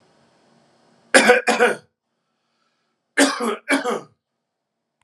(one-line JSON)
{"cough_length": "5.0 s", "cough_amplitude": 32767, "cough_signal_mean_std_ratio": 0.35, "survey_phase": "alpha (2021-03-01 to 2021-08-12)", "age": "45-64", "gender": "Male", "wearing_mask": "No", "symptom_abdominal_pain": true, "symptom_diarrhoea": true, "symptom_fever_high_temperature": true, "symptom_headache": true, "symptom_onset": "2 days", "smoker_status": "Current smoker (1 to 10 cigarettes per day)", "respiratory_condition_asthma": false, "respiratory_condition_other": false, "recruitment_source": "Test and Trace", "submission_delay": "1 day", "covid_test_result": "Positive", "covid_test_method": "LFT"}